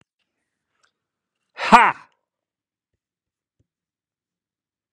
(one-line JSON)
{"exhalation_length": "4.9 s", "exhalation_amplitude": 32768, "exhalation_signal_mean_std_ratio": 0.16, "survey_phase": "beta (2021-08-13 to 2022-03-07)", "age": "65+", "gender": "Male", "wearing_mask": "No", "symptom_none": true, "smoker_status": "Ex-smoker", "respiratory_condition_asthma": false, "respiratory_condition_other": false, "recruitment_source": "REACT", "submission_delay": "2 days", "covid_test_result": "Negative", "covid_test_method": "RT-qPCR", "influenza_a_test_result": "Negative", "influenza_b_test_result": "Negative"}